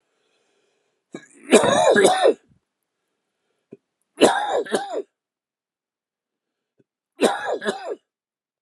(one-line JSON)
{"three_cough_length": "8.6 s", "three_cough_amplitude": 32631, "three_cough_signal_mean_std_ratio": 0.36, "survey_phase": "beta (2021-08-13 to 2022-03-07)", "age": "45-64", "gender": "Male", "wearing_mask": "No", "symptom_cough_any": true, "symptom_runny_or_blocked_nose": true, "symptom_sore_throat": true, "symptom_fatigue": true, "symptom_onset": "3 days", "smoker_status": "Never smoked", "respiratory_condition_asthma": false, "respiratory_condition_other": true, "recruitment_source": "Test and Trace", "submission_delay": "2 days", "covid_test_result": "Positive", "covid_test_method": "RT-qPCR", "covid_ct_value": 23.1, "covid_ct_gene": "ORF1ab gene", "covid_ct_mean": 24.5, "covid_viral_load": "8900 copies/ml", "covid_viral_load_category": "Minimal viral load (< 10K copies/ml)"}